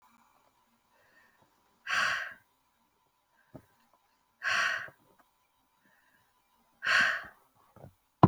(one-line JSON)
{"exhalation_length": "8.3 s", "exhalation_amplitude": 18926, "exhalation_signal_mean_std_ratio": 0.27, "survey_phase": "beta (2021-08-13 to 2022-03-07)", "age": "18-44", "gender": "Female", "wearing_mask": "No", "symptom_none": true, "smoker_status": "Never smoked", "respiratory_condition_asthma": false, "respiratory_condition_other": false, "recruitment_source": "REACT", "submission_delay": "3 days", "covid_test_result": "Negative", "covid_test_method": "RT-qPCR"}